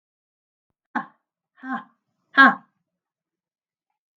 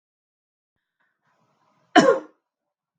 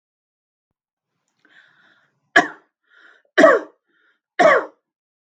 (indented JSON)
{
  "exhalation_length": "4.2 s",
  "exhalation_amplitude": 31937,
  "exhalation_signal_mean_std_ratio": 0.19,
  "cough_length": "3.0 s",
  "cough_amplitude": 32054,
  "cough_signal_mean_std_ratio": 0.21,
  "three_cough_length": "5.4 s",
  "three_cough_amplitude": 32768,
  "three_cough_signal_mean_std_ratio": 0.25,
  "survey_phase": "beta (2021-08-13 to 2022-03-07)",
  "age": "45-64",
  "gender": "Female",
  "wearing_mask": "No",
  "symptom_none": true,
  "symptom_onset": "5 days",
  "smoker_status": "Never smoked",
  "respiratory_condition_asthma": false,
  "respiratory_condition_other": false,
  "recruitment_source": "REACT",
  "submission_delay": "1 day",
  "covid_test_result": "Negative",
  "covid_test_method": "RT-qPCR"
}